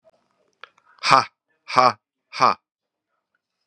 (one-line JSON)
{"exhalation_length": "3.7 s", "exhalation_amplitude": 32767, "exhalation_signal_mean_std_ratio": 0.26, "survey_phase": "beta (2021-08-13 to 2022-03-07)", "age": "45-64", "gender": "Female", "wearing_mask": "No", "symptom_cough_any": true, "symptom_new_continuous_cough": true, "symptom_runny_or_blocked_nose": true, "symptom_sore_throat": true, "symptom_fatigue": true, "symptom_fever_high_temperature": true, "symptom_headache": true, "symptom_onset": "6 days", "smoker_status": "Never smoked", "respiratory_condition_asthma": false, "respiratory_condition_other": false, "recruitment_source": "Test and Trace", "submission_delay": "4 days", "covid_test_result": "Positive", "covid_test_method": "ePCR"}